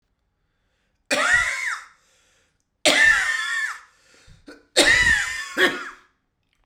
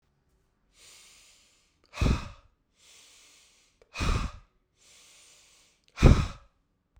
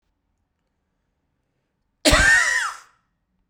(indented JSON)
{
  "three_cough_length": "6.7 s",
  "three_cough_amplitude": 32767,
  "three_cough_signal_mean_std_ratio": 0.49,
  "exhalation_length": "7.0 s",
  "exhalation_amplitude": 21766,
  "exhalation_signal_mean_std_ratio": 0.24,
  "cough_length": "3.5 s",
  "cough_amplitude": 26449,
  "cough_signal_mean_std_ratio": 0.35,
  "survey_phase": "beta (2021-08-13 to 2022-03-07)",
  "age": "18-44",
  "gender": "Male",
  "wearing_mask": "No",
  "symptom_cough_any": true,
  "symptom_runny_or_blocked_nose": true,
  "symptom_fatigue": true,
  "symptom_change_to_sense_of_smell_or_taste": true,
  "symptom_onset": "3 days",
  "smoker_status": "Ex-smoker",
  "respiratory_condition_asthma": false,
  "respiratory_condition_other": false,
  "recruitment_source": "Test and Trace",
  "submission_delay": "2 days",
  "covid_test_result": "Positive",
  "covid_test_method": "ePCR"
}